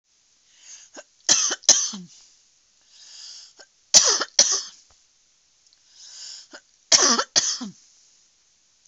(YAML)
three_cough_length: 8.9 s
three_cough_amplitude: 32768
three_cough_signal_mean_std_ratio: 0.32
survey_phase: beta (2021-08-13 to 2022-03-07)
age: 65+
gender: Female
wearing_mask: 'No'
symptom_none: true
smoker_status: Never smoked
respiratory_condition_asthma: false
respiratory_condition_other: false
recruitment_source: REACT
submission_delay: 2 days
covid_test_result: Negative
covid_test_method: RT-qPCR
influenza_a_test_result: Negative
influenza_b_test_result: Negative